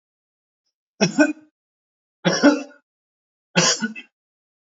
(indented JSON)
{
  "three_cough_length": "4.8 s",
  "three_cough_amplitude": 26567,
  "three_cough_signal_mean_std_ratio": 0.33,
  "survey_phase": "alpha (2021-03-01 to 2021-08-12)",
  "age": "45-64",
  "gender": "Male",
  "wearing_mask": "No",
  "symptom_none": true,
  "smoker_status": "Ex-smoker",
  "respiratory_condition_asthma": false,
  "respiratory_condition_other": false,
  "recruitment_source": "REACT",
  "submission_delay": "1 day",
  "covid_test_result": "Negative",
  "covid_test_method": "RT-qPCR"
}